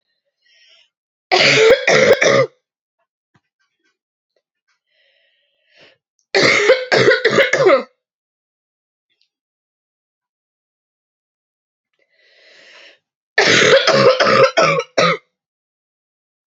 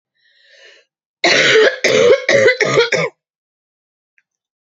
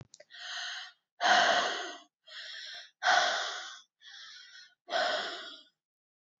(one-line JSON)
{"three_cough_length": "16.5 s", "three_cough_amplitude": 32767, "three_cough_signal_mean_std_ratio": 0.41, "cough_length": "4.7 s", "cough_amplitude": 32767, "cough_signal_mean_std_ratio": 0.5, "exhalation_length": "6.4 s", "exhalation_amplitude": 8056, "exhalation_signal_mean_std_ratio": 0.48, "survey_phase": "beta (2021-08-13 to 2022-03-07)", "age": "18-44", "gender": "Female", "wearing_mask": "No", "symptom_cough_any": true, "symptom_new_continuous_cough": true, "symptom_runny_or_blocked_nose": true, "symptom_sore_throat": true, "symptom_fatigue": true, "symptom_headache": true, "symptom_onset": "3 days", "smoker_status": "Never smoked", "respiratory_condition_asthma": false, "respiratory_condition_other": false, "recruitment_source": "Test and Trace", "submission_delay": "2 days", "covid_test_result": "Positive", "covid_test_method": "RT-qPCR", "covid_ct_value": 19.9, "covid_ct_gene": "ORF1ab gene", "covid_ct_mean": 20.3, "covid_viral_load": "210000 copies/ml", "covid_viral_load_category": "Low viral load (10K-1M copies/ml)"}